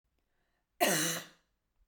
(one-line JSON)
{"cough_length": "1.9 s", "cough_amplitude": 7109, "cough_signal_mean_std_ratio": 0.37, "survey_phase": "beta (2021-08-13 to 2022-03-07)", "age": "18-44", "gender": "Female", "wearing_mask": "No", "symptom_cough_any": true, "symptom_onset": "7 days", "smoker_status": "Never smoked", "respiratory_condition_asthma": true, "respiratory_condition_other": false, "recruitment_source": "REACT", "submission_delay": "1 day", "covid_test_result": "Negative", "covid_test_method": "RT-qPCR"}